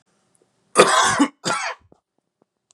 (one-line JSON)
{"cough_length": "2.7 s", "cough_amplitude": 32768, "cough_signal_mean_std_ratio": 0.39, "survey_phase": "beta (2021-08-13 to 2022-03-07)", "age": "18-44", "gender": "Male", "wearing_mask": "No", "symptom_cough_any": true, "symptom_runny_or_blocked_nose": true, "symptom_sore_throat": true, "symptom_fatigue": true, "symptom_headache": true, "smoker_status": "Ex-smoker", "respiratory_condition_asthma": false, "respiratory_condition_other": false, "recruitment_source": "Test and Trace", "submission_delay": "2 days", "covid_test_result": "Positive", "covid_test_method": "LFT"}